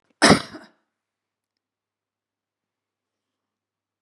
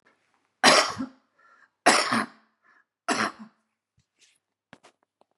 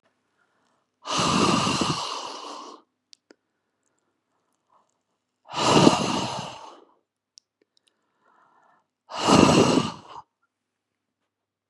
{"cough_length": "4.0 s", "cough_amplitude": 32768, "cough_signal_mean_std_ratio": 0.16, "three_cough_length": "5.4 s", "three_cough_amplitude": 25472, "three_cough_signal_mean_std_ratio": 0.3, "exhalation_length": "11.7 s", "exhalation_amplitude": 31175, "exhalation_signal_mean_std_ratio": 0.37, "survey_phase": "beta (2021-08-13 to 2022-03-07)", "age": "65+", "gender": "Female", "wearing_mask": "No", "symptom_cough_any": true, "smoker_status": "Never smoked", "respiratory_condition_asthma": false, "respiratory_condition_other": false, "recruitment_source": "REACT", "submission_delay": "2 days", "covid_test_result": "Negative", "covid_test_method": "RT-qPCR", "influenza_a_test_result": "Negative", "influenza_b_test_result": "Negative"}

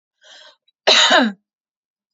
{"cough_length": "2.1 s", "cough_amplitude": 30519, "cough_signal_mean_std_ratio": 0.38, "survey_phase": "beta (2021-08-13 to 2022-03-07)", "age": "18-44", "gender": "Female", "wearing_mask": "No", "symptom_none": true, "smoker_status": "Ex-smoker", "respiratory_condition_asthma": true, "respiratory_condition_other": false, "recruitment_source": "REACT", "submission_delay": "1 day", "covid_test_result": "Negative", "covid_test_method": "RT-qPCR", "influenza_a_test_result": "Negative", "influenza_b_test_result": "Negative"}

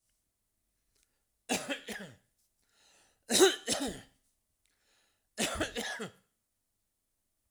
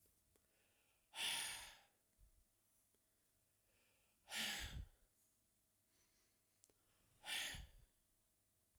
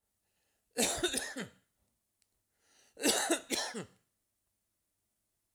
{"three_cough_length": "7.5 s", "three_cough_amplitude": 9968, "three_cough_signal_mean_std_ratio": 0.3, "exhalation_length": "8.8 s", "exhalation_amplitude": 930, "exhalation_signal_mean_std_ratio": 0.37, "cough_length": "5.5 s", "cough_amplitude": 6300, "cough_signal_mean_std_ratio": 0.37, "survey_phase": "alpha (2021-03-01 to 2021-08-12)", "age": "65+", "gender": "Male", "wearing_mask": "No", "symptom_none": true, "smoker_status": "Ex-smoker", "respiratory_condition_asthma": false, "respiratory_condition_other": false, "recruitment_source": "REACT", "submission_delay": "3 days", "covid_test_result": "Negative", "covid_test_method": "RT-qPCR"}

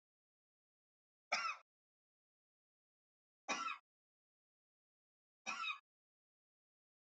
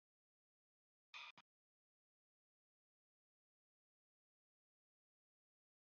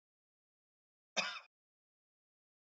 {"three_cough_length": "7.1 s", "three_cough_amplitude": 1839, "three_cough_signal_mean_std_ratio": 0.26, "exhalation_length": "5.9 s", "exhalation_amplitude": 220, "exhalation_signal_mean_std_ratio": 0.14, "cough_length": "2.6 s", "cough_amplitude": 2915, "cough_signal_mean_std_ratio": 0.2, "survey_phase": "beta (2021-08-13 to 2022-03-07)", "age": "45-64", "gender": "Male", "wearing_mask": "No", "symptom_none": true, "smoker_status": "Never smoked", "respiratory_condition_asthma": false, "respiratory_condition_other": false, "recruitment_source": "REACT", "submission_delay": "1 day", "covid_test_result": "Negative", "covid_test_method": "RT-qPCR"}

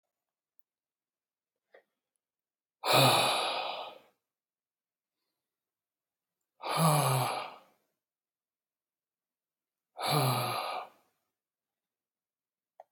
{"exhalation_length": "12.9 s", "exhalation_amplitude": 8893, "exhalation_signal_mean_std_ratio": 0.34, "survey_phase": "beta (2021-08-13 to 2022-03-07)", "age": "45-64", "gender": "Male", "wearing_mask": "No", "symptom_cough_any": true, "symptom_new_continuous_cough": true, "symptom_runny_or_blocked_nose": true, "symptom_fatigue": true, "symptom_fever_high_temperature": true, "symptom_headache": true, "symptom_change_to_sense_of_smell_or_taste": true, "symptom_loss_of_taste": true, "symptom_onset": "6 days", "smoker_status": "Never smoked", "respiratory_condition_asthma": false, "respiratory_condition_other": false, "recruitment_source": "Test and Trace", "submission_delay": "2 days", "covid_test_result": "Positive", "covid_test_method": "RT-qPCR", "covid_ct_value": 15.9, "covid_ct_gene": "S gene", "covid_ct_mean": 16.1, "covid_viral_load": "5200000 copies/ml", "covid_viral_load_category": "High viral load (>1M copies/ml)"}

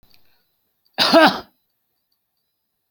{"cough_length": "2.9 s", "cough_amplitude": 28720, "cough_signal_mean_std_ratio": 0.28, "survey_phase": "beta (2021-08-13 to 2022-03-07)", "age": "65+", "gender": "Male", "wearing_mask": "No", "symptom_none": true, "smoker_status": "Never smoked", "respiratory_condition_asthma": false, "respiratory_condition_other": false, "recruitment_source": "REACT", "submission_delay": "3 days", "covid_test_result": "Negative", "covid_test_method": "RT-qPCR"}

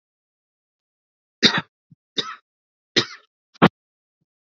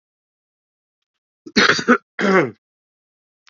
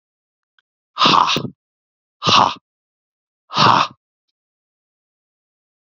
{"three_cough_length": "4.5 s", "three_cough_amplitude": 32767, "three_cough_signal_mean_std_ratio": 0.2, "cough_length": "3.5 s", "cough_amplitude": 28764, "cough_signal_mean_std_ratio": 0.33, "exhalation_length": "6.0 s", "exhalation_amplitude": 31470, "exhalation_signal_mean_std_ratio": 0.32, "survey_phase": "beta (2021-08-13 to 2022-03-07)", "age": "18-44", "gender": "Male", "wearing_mask": "No", "symptom_cough_any": true, "symptom_runny_or_blocked_nose": true, "symptom_sore_throat": true, "symptom_fatigue": true, "symptom_onset": "5 days", "smoker_status": "Current smoker (e-cigarettes or vapes only)", "respiratory_condition_asthma": false, "respiratory_condition_other": false, "recruitment_source": "Test and Trace", "submission_delay": "1 day", "covid_test_result": "Positive", "covid_test_method": "RT-qPCR", "covid_ct_value": 17.6, "covid_ct_gene": "N gene"}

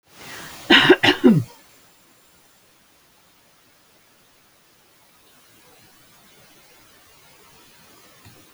{"cough_length": "8.5 s", "cough_amplitude": 29451, "cough_signal_mean_std_ratio": 0.24, "survey_phase": "alpha (2021-03-01 to 2021-08-12)", "age": "65+", "gender": "Female", "wearing_mask": "No", "symptom_cough_any": true, "symptom_fatigue": true, "smoker_status": "Ex-smoker", "respiratory_condition_asthma": false, "respiratory_condition_other": false, "recruitment_source": "REACT", "submission_delay": "2 days", "covid_test_result": "Negative", "covid_test_method": "RT-qPCR"}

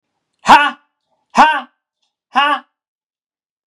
{"exhalation_length": "3.7 s", "exhalation_amplitude": 32768, "exhalation_signal_mean_std_ratio": 0.33, "survey_phase": "beta (2021-08-13 to 2022-03-07)", "age": "18-44", "gender": "Male", "wearing_mask": "No", "symptom_none": true, "smoker_status": "Never smoked", "respiratory_condition_asthma": false, "respiratory_condition_other": false, "recruitment_source": "REACT", "submission_delay": "1 day", "covid_test_result": "Negative", "covid_test_method": "RT-qPCR", "influenza_a_test_result": "Negative", "influenza_b_test_result": "Negative"}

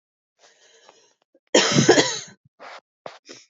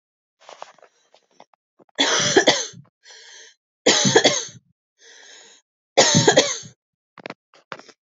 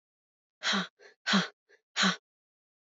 {"cough_length": "3.5 s", "cough_amplitude": 27056, "cough_signal_mean_std_ratio": 0.33, "three_cough_length": "8.1 s", "three_cough_amplitude": 32703, "three_cough_signal_mean_std_ratio": 0.36, "exhalation_length": "2.8 s", "exhalation_amplitude": 7294, "exhalation_signal_mean_std_ratio": 0.37, "survey_phase": "alpha (2021-03-01 to 2021-08-12)", "age": "18-44", "gender": "Female", "wearing_mask": "No", "symptom_fatigue": true, "symptom_fever_high_temperature": true, "symptom_headache": true, "smoker_status": "Current smoker (1 to 10 cigarettes per day)", "respiratory_condition_asthma": false, "respiratory_condition_other": false, "recruitment_source": "Test and Trace", "submission_delay": "1 day", "covid_test_result": "Positive", "covid_test_method": "RT-qPCR"}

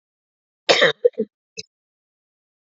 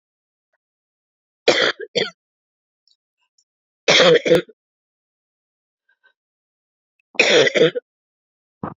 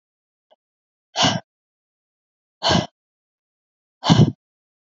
{"cough_length": "2.7 s", "cough_amplitude": 31799, "cough_signal_mean_std_ratio": 0.26, "three_cough_length": "8.8 s", "three_cough_amplitude": 29242, "three_cough_signal_mean_std_ratio": 0.31, "exhalation_length": "4.9 s", "exhalation_amplitude": 27843, "exhalation_signal_mean_std_ratio": 0.28, "survey_phase": "beta (2021-08-13 to 2022-03-07)", "age": "18-44", "gender": "Female", "wearing_mask": "No", "symptom_cough_any": true, "symptom_new_continuous_cough": true, "symptom_runny_or_blocked_nose": true, "symptom_shortness_of_breath": true, "symptom_sore_throat": true, "symptom_abdominal_pain": true, "symptom_fatigue": true, "symptom_headache": true, "symptom_onset": "2 days", "smoker_status": "Ex-smoker", "respiratory_condition_asthma": true, "respiratory_condition_other": false, "recruitment_source": "Test and Trace", "submission_delay": "2 days", "covid_test_result": "Positive", "covid_test_method": "RT-qPCR", "covid_ct_value": 24.0, "covid_ct_gene": "ORF1ab gene", "covid_ct_mean": 24.2, "covid_viral_load": "12000 copies/ml", "covid_viral_load_category": "Low viral load (10K-1M copies/ml)"}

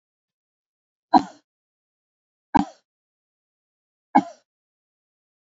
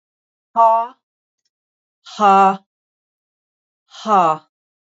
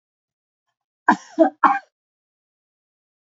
{"three_cough_length": "5.5 s", "three_cough_amplitude": 26977, "three_cough_signal_mean_std_ratio": 0.15, "exhalation_length": "4.9 s", "exhalation_amplitude": 26729, "exhalation_signal_mean_std_ratio": 0.36, "cough_length": "3.3 s", "cough_amplitude": 27276, "cough_signal_mean_std_ratio": 0.23, "survey_phase": "alpha (2021-03-01 to 2021-08-12)", "age": "65+", "gender": "Female", "wearing_mask": "No", "symptom_none": true, "smoker_status": "Ex-smoker", "respiratory_condition_asthma": false, "respiratory_condition_other": false, "recruitment_source": "REACT", "submission_delay": "1 day", "covid_test_result": "Negative", "covid_test_method": "RT-qPCR"}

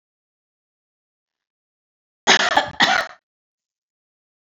{"cough_length": "4.4 s", "cough_amplitude": 28091, "cough_signal_mean_std_ratio": 0.28, "survey_phase": "beta (2021-08-13 to 2022-03-07)", "age": "45-64", "gender": "Female", "wearing_mask": "No", "symptom_cough_any": true, "symptom_runny_or_blocked_nose": true, "symptom_sore_throat": true, "smoker_status": "Current smoker (1 to 10 cigarettes per day)", "respiratory_condition_asthma": false, "respiratory_condition_other": false, "recruitment_source": "Test and Trace", "submission_delay": "2 days", "covid_test_result": "Positive", "covid_test_method": "RT-qPCR", "covid_ct_value": 22.0, "covid_ct_gene": "ORF1ab gene", "covid_ct_mean": 22.5, "covid_viral_load": "41000 copies/ml", "covid_viral_load_category": "Low viral load (10K-1M copies/ml)"}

